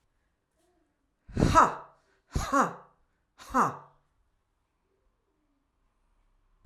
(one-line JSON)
{"exhalation_length": "6.7 s", "exhalation_amplitude": 14532, "exhalation_signal_mean_std_ratio": 0.28, "survey_phase": "alpha (2021-03-01 to 2021-08-12)", "age": "45-64", "gender": "Female", "wearing_mask": "No", "symptom_none": true, "smoker_status": "Ex-smoker", "respiratory_condition_asthma": true, "respiratory_condition_other": false, "recruitment_source": "REACT", "submission_delay": "5 days", "covid_test_result": "Negative", "covid_test_method": "RT-qPCR"}